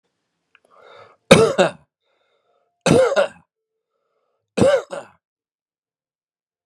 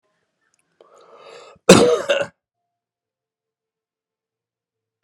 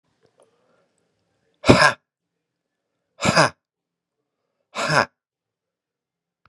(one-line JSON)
{"three_cough_length": "6.7 s", "three_cough_amplitude": 32768, "three_cough_signal_mean_std_ratio": 0.3, "cough_length": "5.0 s", "cough_amplitude": 32768, "cough_signal_mean_std_ratio": 0.23, "exhalation_length": "6.5 s", "exhalation_amplitude": 32768, "exhalation_signal_mean_std_ratio": 0.24, "survey_phase": "beta (2021-08-13 to 2022-03-07)", "age": "45-64", "gender": "Male", "wearing_mask": "No", "symptom_sore_throat": true, "symptom_fatigue": true, "symptom_headache": true, "symptom_change_to_sense_of_smell_or_taste": true, "symptom_loss_of_taste": true, "symptom_onset": "12 days", "smoker_status": "Never smoked", "respiratory_condition_asthma": false, "respiratory_condition_other": false, "recruitment_source": "REACT", "submission_delay": "2 days", "covid_test_result": "Negative", "covid_test_method": "RT-qPCR"}